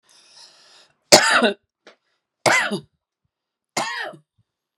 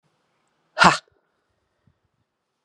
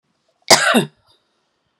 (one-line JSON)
{"three_cough_length": "4.8 s", "three_cough_amplitude": 32768, "three_cough_signal_mean_std_ratio": 0.32, "exhalation_length": "2.6 s", "exhalation_amplitude": 32767, "exhalation_signal_mean_std_ratio": 0.18, "cough_length": "1.8 s", "cough_amplitude": 32768, "cough_signal_mean_std_ratio": 0.33, "survey_phase": "beta (2021-08-13 to 2022-03-07)", "age": "45-64", "gender": "Female", "wearing_mask": "No", "symptom_none": true, "smoker_status": "Never smoked", "respiratory_condition_asthma": true, "respiratory_condition_other": false, "recruitment_source": "REACT", "submission_delay": "0 days", "covid_test_result": "Negative", "covid_test_method": "RT-qPCR"}